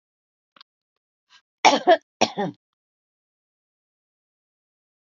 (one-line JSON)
{"cough_length": "5.1 s", "cough_amplitude": 28964, "cough_signal_mean_std_ratio": 0.2, "survey_phase": "alpha (2021-03-01 to 2021-08-12)", "age": "45-64", "gender": "Female", "wearing_mask": "No", "symptom_none": true, "smoker_status": "Never smoked", "respiratory_condition_asthma": false, "respiratory_condition_other": false, "recruitment_source": "REACT", "submission_delay": "2 days", "covid_test_result": "Negative", "covid_test_method": "RT-qPCR"}